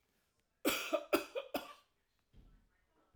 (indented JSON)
{
  "three_cough_length": "3.2 s",
  "three_cough_amplitude": 4507,
  "three_cough_signal_mean_std_ratio": 0.34,
  "survey_phase": "alpha (2021-03-01 to 2021-08-12)",
  "age": "45-64",
  "gender": "Male",
  "wearing_mask": "No",
  "symptom_none": true,
  "smoker_status": "Ex-smoker",
  "respiratory_condition_asthma": false,
  "respiratory_condition_other": false,
  "recruitment_source": "REACT",
  "submission_delay": "1 day",
  "covid_test_result": "Negative",
  "covid_test_method": "RT-qPCR"
}